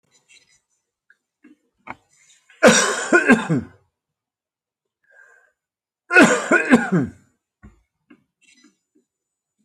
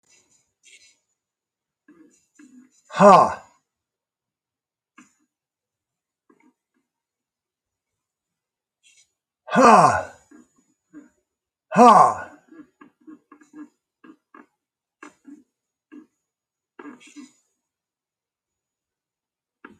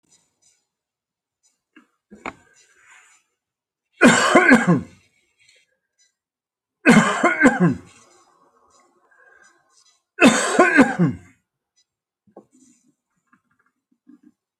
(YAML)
cough_length: 9.6 s
cough_amplitude: 29217
cough_signal_mean_std_ratio: 0.31
exhalation_length: 19.8 s
exhalation_amplitude: 28961
exhalation_signal_mean_std_ratio: 0.2
three_cough_length: 14.6 s
three_cough_amplitude: 29568
three_cough_signal_mean_std_ratio: 0.31
survey_phase: alpha (2021-03-01 to 2021-08-12)
age: 65+
gender: Male
wearing_mask: 'No'
symptom_none: true
smoker_status: Ex-smoker
respiratory_condition_asthma: false
respiratory_condition_other: false
recruitment_source: REACT
submission_delay: 1 day
covid_test_result: Negative
covid_test_method: RT-qPCR